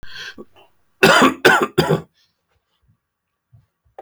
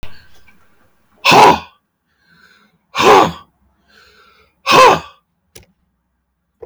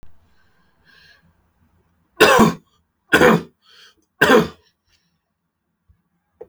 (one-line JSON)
{"cough_length": "4.0 s", "cough_amplitude": 32768, "cough_signal_mean_std_ratio": 0.36, "exhalation_length": "6.7 s", "exhalation_amplitude": 32768, "exhalation_signal_mean_std_ratio": 0.35, "three_cough_length": "6.5 s", "three_cough_amplitude": 31092, "three_cough_signal_mean_std_ratio": 0.3, "survey_phase": "alpha (2021-03-01 to 2021-08-12)", "age": "45-64", "gender": "Male", "wearing_mask": "No", "symptom_none": true, "smoker_status": "Never smoked", "respiratory_condition_asthma": false, "respiratory_condition_other": false, "recruitment_source": "REACT", "submission_delay": "1 day", "covid_test_result": "Negative", "covid_test_method": "RT-qPCR"}